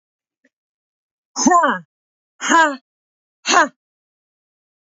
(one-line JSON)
{"exhalation_length": "4.9 s", "exhalation_amplitude": 28057, "exhalation_signal_mean_std_ratio": 0.33, "survey_phase": "beta (2021-08-13 to 2022-03-07)", "age": "18-44", "gender": "Female", "wearing_mask": "No", "symptom_sore_throat": true, "symptom_onset": "12 days", "smoker_status": "Never smoked", "respiratory_condition_asthma": false, "respiratory_condition_other": false, "recruitment_source": "REACT", "submission_delay": "3 days", "covid_test_result": "Negative", "covid_test_method": "RT-qPCR", "influenza_a_test_result": "Negative", "influenza_b_test_result": "Negative"}